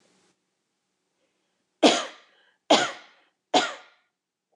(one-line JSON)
{"three_cough_length": "4.6 s", "three_cough_amplitude": 20162, "three_cough_signal_mean_std_ratio": 0.26, "survey_phase": "beta (2021-08-13 to 2022-03-07)", "age": "45-64", "gender": "Female", "wearing_mask": "No", "symptom_none": true, "smoker_status": "Ex-smoker", "respiratory_condition_asthma": false, "respiratory_condition_other": false, "recruitment_source": "REACT", "submission_delay": "2 days", "covid_test_result": "Negative", "covid_test_method": "RT-qPCR", "influenza_a_test_result": "Negative", "influenza_b_test_result": "Negative"}